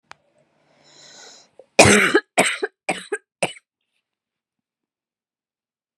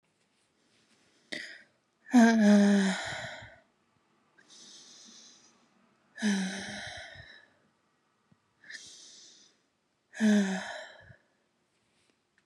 {"cough_length": "6.0 s", "cough_amplitude": 32768, "cough_signal_mean_std_ratio": 0.27, "exhalation_length": "12.5 s", "exhalation_amplitude": 10432, "exhalation_signal_mean_std_ratio": 0.33, "survey_phase": "beta (2021-08-13 to 2022-03-07)", "age": "18-44", "gender": "Female", "wearing_mask": "No", "symptom_cough_any": true, "symptom_new_continuous_cough": true, "symptom_runny_or_blocked_nose": true, "symptom_sore_throat": true, "symptom_headache": true, "symptom_onset": "6 days", "smoker_status": "Never smoked", "respiratory_condition_asthma": true, "respiratory_condition_other": false, "recruitment_source": "Test and Trace", "submission_delay": "2 days", "covid_test_result": "Positive", "covid_test_method": "RT-qPCR", "covid_ct_value": 27.7, "covid_ct_gene": "ORF1ab gene"}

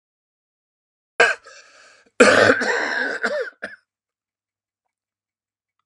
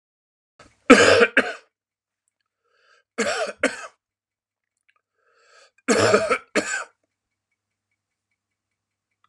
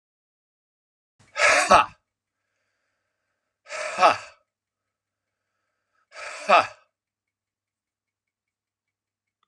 {"cough_length": "5.9 s", "cough_amplitude": 32767, "cough_signal_mean_std_ratio": 0.34, "three_cough_length": "9.3 s", "three_cough_amplitude": 32768, "three_cough_signal_mean_std_ratio": 0.29, "exhalation_length": "9.5 s", "exhalation_amplitude": 28149, "exhalation_signal_mean_std_ratio": 0.24, "survey_phase": "alpha (2021-03-01 to 2021-08-12)", "age": "65+", "gender": "Male", "wearing_mask": "No", "symptom_headache": true, "smoker_status": "Ex-smoker", "respiratory_condition_asthma": false, "respiratory_condition_other": false, "recruitment_source": "Test and Trace", "submission_delay": "2 days", "covid_test_result": "Positive", "covid_test_method": "LFT"}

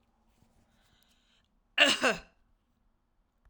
{"cough_length": "3.5 s", "cough_amplitude": 15086, "cough_signal_mean_std_ratio": 0.24, "survey_phase": "alpha (2021-03-01 to 2021-08-12)", "age": "45-64", "gender": "Female", "wearing_mask": "No", "symptom_none": true, "smoker_status": "Never smoked", "respiratory_condition_asthma": false, "respiratory_condition_other": false, "recruitment_source": "REACT", "submission_delay": "3 days", "covid_test_result": "Negative", "covid_test_method": "RT-qPCR"}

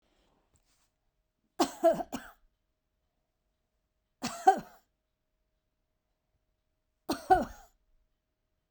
{"three_cough_length": "8.7 s", "three_cough_amplitude": 12804, "three_cough_signal_mean_std_ratio": 0.21, "survey_phase": "beta (2021-08-13 to 2022-03-07)", "age": "45-64", "gender": "Female", "wearing_mask": "No", "symptom_none": true, "smoker_status": "Never smoked", "respiratory_condition_asthma": false, "respiratory_condition_other": false, "recruitment_source": "REACT", "submission_delay": "4 days", "covid_test_result": "Negative", "covid_test_method": "RT-qPCR"}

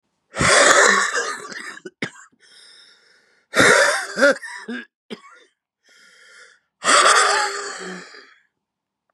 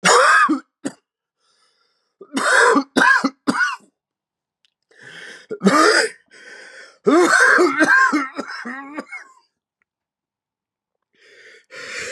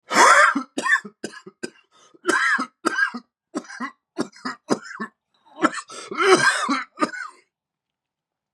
{"exhalation_length": "9.1 s", "exhalation_amplitude": 32767, "exhalation_signal_mean_std_ratio": 0.45, "three_cough_length": "12.1 s", "three_cough_amplitude": 29777, "three_cough_signal_mean_std_ratio": 0.47, "cough_length": "8.5 s", "cough_amplitude": 28609, "cough_signal_mean_std_ratio": 0.44, "survey_phase": "beta (2021-08-13 to 2022-03-07)", "age": "45-64", "gender": "Male", "wearing_mask": "No", "symptom_cough_any": true, "symptom_runny_or_blocked_nose": true, "symptom_shortness_of_breath": true, "symptom_fatigue": true, "symptom_other": true, "symptom_onset": "4 days", "smoker_status": "Ex-smoker", "respiratory_condition_asthma": false, "respiratory_condition_other": false, "recruitment_source": "Test and Trace", "submission_delay": "2 days", "covid_test_result": "Positive", "covid_test_method": "RT-qPCR", "covid_ct_value": 17.3, "covid_ct_gene": "ORF1ab gene"}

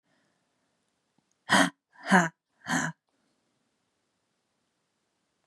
{"exhalation_length": "5.5 s", "exhalation_amplitude": 16926, "exhalation_signal_mean_std_ratio": 0.24, "survey_phase": "beta (2021-08-13 to 2022-03-07)", "age": "18-44", "gender": "Female", "wearing_mask": "No", "symptom_cough_any": true, "symptom_runny_or_blocked_nose": true, "symptom_sore_throat": true, "symptom_fatigue": true, "symptom_headache": true, "symptom_change_to_sense_of_smell_or_taste": true, "symptom_loss_of_taste": true, "symptom_onset": "3 days", "smoker_status": "Never smoked", "respiratory_condition_asthma": false, "respiratory_condition_other": false, "recruitment_source": "Test and Trace", "submission_delay": "2 days", "covid_test_result": "Positive", "covid_test_method": "RT-qPCR", "covid_ct_value": 29.7, "covid_ct_gene": "ORF1ab gene", "covid_ct_mean": 30.0, "covid_viral_load": "140 copies/ml", "covid_viral_load_category": "Minimal viral load (< 10K copies/ml)"}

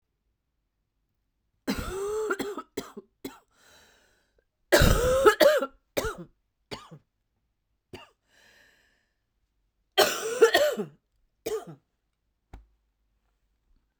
{"cough_length": "14.0 s", "cough_amplitude": 18369, "cough_signal_mean_std_ratio": 0.32, "survey_phase": "beta (2021-08-13 to 2022-03-07)", "age": "45-64", "gender": "Female", "wearing_mask": "No", "symptom_cough_any": true, "symptom_runny_or_blocked_nose": true, "symptom_fatigue": true, "smoker_status": "Ex-smoker", "respiratory_condition_asthma": true, "respiratory_condition_other": false, "recruitment_source": "Test and Trace", "submission_delay": "2 days", "covid_test_result": "Positive", "covid_test_method": "RT-qPCR", "covid_ct_value": 23.1, "covid_ct_gene": "ORF1ab gene", "covid_ct_mean": 23.9, "covid_viral_load": "15000 copies/ml", "covid_viral_load_category": "Low viral load (10K-1M copies/ml)"}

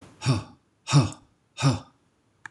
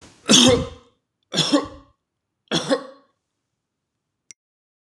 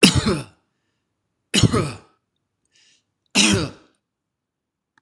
{"exhalation_length": "2.5 s", "exhalation_amplitude": 15813, "exhalation_signal_mean_std_ratio": 0.38, "three_cough_length": "4.9 s", "three_cough_amplitude": 26028, "three_cough_signal_mean_std_ratio": 0.33, "cough_length": "5.0 s", "cough_amplitude": 26028, "cough_signal_mean_std_ratio": 0.33, "survey_phase": "beta (2021-08-13 to 2022-03-07)", "age": "45-64", "gender": "Male", "wearing_mask": "No", "symptom_none": true, "smoker_status": "Never smoked", "respiratory_condition_asthma": false, "respiratory_condition_other": false, "recruitment_source": "REACT", "submission_delay": "2 days", "covid_test_result": "Negative", "covid_test_method": "RT-qPCR"}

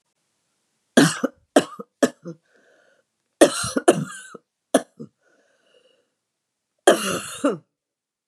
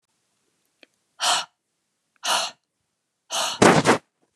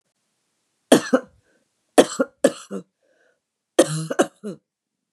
{"cough_length": "8.3 s", "cough_amplitude": 32767, "cough_signal_mean_std_ratio": 0.28, "exhalation_length": "4.4 s", "exhalation_amplitude": 32607, "exhalation_signal_mean_std_ratio": 0.34, "three_cough_length": "5.1 s", "three_cough_amplitude": 32767, "three_cough_signal_mean_std_ratio": 0.26, "survey_phase": "beta (2021-08-13 to 2022-03-07)", "age": "45-64", "gender": "Female", "wearing_mask": "No", "symptom_cough_any": true, "symptom_runny_or_blocked_nose": true, "symptom_sore_throat": true, "symptom_fatigue": true, "symptom_headache": true, "symptom_onset": "2 days", "smoker_status": "Never smoked", "respiratory_condition_asthma": false, "respiratory_condition_other": false, "recruitment_source": "Test and Trace", "submission_delay": "1 day", "covid_test_result": "Positive", "covid_test_method": "RT-qPCR", "covid_ct_value": 18.7, "covid_ct_gene": "N gene", "covid_ct_mean": 19.1, "covid_viral_load": "560000 copies/ml", "covid_viral_load_category": "Low viral load (10K-1M copies/ml)"}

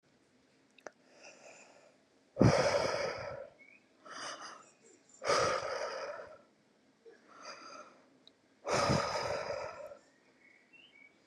{"exhalation_length": "11.3 s", "exhalation_amplitude": 10873, "exhalation_signal_mean_std_ratio": 0.43, "survey_phase": "alpha (2021-03-01 to 2021-08-12)", "age": "18-44", "gender": "Female", "wearing_mask": "No", "symptom_none": true, "smoker_status": "Current smoker (11 or more cigarettes per day)", "respiratory_condition_asthma": false, "respiratory_condition_other": false, "recruitment_source": "REACT", "submission_delay": "2 days", "covid_test_result": "Negative", "covid_test_method": "RT-qPCR"}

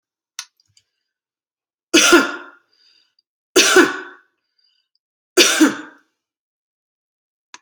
{"three_cough_length": "7.6 s", "three_cough_amplitude": 32741, "three_cough_signal_mean_std_ratio": 0.3, "survey_phase": "alpha (2021-03-01 to 2021-08-12)", "age": "45-64", "gender": "Female", "wearing_mask": "No", "symptom_none": true, "smoker_status": "Never smoked", "respiratory_condition_asthma": false, "respiratory_condition_other": false, "recruitment_source": "REACT", "submission_delay": "3 days", "covid_test_result": "Negative", "covid_test_method": "RT-qPCR"}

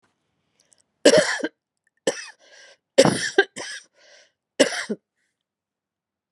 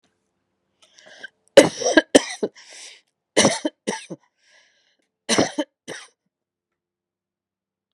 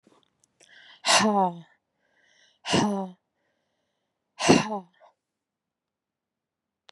{"cough_length": "6.3 s", "cough_amplitude": 31934, "cough_signal_mean_std_ratio": 0.29, "three_cough_length": "7.9 s", "three_cough_amplitude": 32768, "three_cough_signal_mean_std_ratio": 0.24, "exhalation_length": "6.9 s", "exhalation_amplitude": 20986, "exhalation_signal_mean_std_ratio": 0.32, "survey_phase": "beta (2021-08-13 to 2022-03-07)", "age": "45-64", "gender": "Female", "wearing_mask": "No", "symptom_cough_any": true, "symptom_runny_or_blocked_nose": true, "symptom_sore_throat": true, "symptom_fatigue": true, "symptom_fever_high_temperature": true, "symptom_headache": true, "symptom_change_to_sense_of_smell_or_taste": true, "smoker_status": "Current smoker (1 to 10 cigarettes per day)", "respiratory_condition_asthma": false, "respiratory_condition_other": false, "recruitment_source": "Test and Trace", "submission_delay": "2 days", "covid_test_result": "Positive", "covid_test_method": "LFT"}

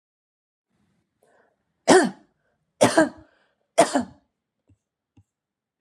{"three_cough_length": "5.8 s", "three_cough_amplitude": 28856, "three_cough_signal_mean_std_ratio": 0.25, "survey_phase": "beta (2021-08-13 to 2022-03-07)", "age": "45-64", "gender": "Female", "wearing_mask": "No", "symptom_none": true, "smoker_status": "Never smoked", "respiratory_condition_asthma": false, "respiratory_condition_other": false, "recruitment_source": "REACT", "submission_delay": "14 days", "covid_test_result": "Negative", "covid_test_method": "RT-qPCR"}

